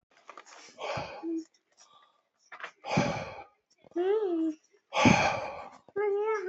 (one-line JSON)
{"exhalation_length": "6.5 s", "exhalation_amplitude": 12837, "exhalation_signal_mean_std_ratio": 0.55, "survey_phase": "beta (2021-08-13 to 2022-03-07)", "age": "18-44", "gender": "Male", "wearing_mask": "No", "symptom_none": true, "smoker_status": "Current smoker (1 to 10 cigarettes per day)", "respiratory_condition_asthma": false, "respiratory_condition_other": false, "recruitment_source": "REACT", "submission_delay": "2 days", "covid_test_result": "Negative", "covid_test_method": "RT-qPCR"}